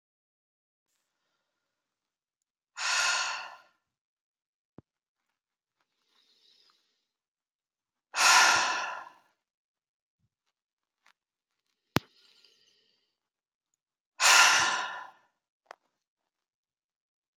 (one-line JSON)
{"exhalation_length": "17.4 s", "exhalation_amplitude": 25496, "exhalation_signal_mean_std_ratio": 0.25, "survey_phase": "alpha (2021-03-01 to 2021-08-12)", "age": "45-64", "gender": "Female", "wearing_mask": "No", "symptom_fatigue": true, "symptom_headache": true, "symptom_onset": "6 days", "smoker_status": "Ex-smoker", "respiratory_condition_asthma": false, "respiratory_condition_other": false, "recruitment_source": "Test and Trace", "submission_delay": "1 day", "covid_test_result": "Positive", "covid_test_method": "RT-qPCR"}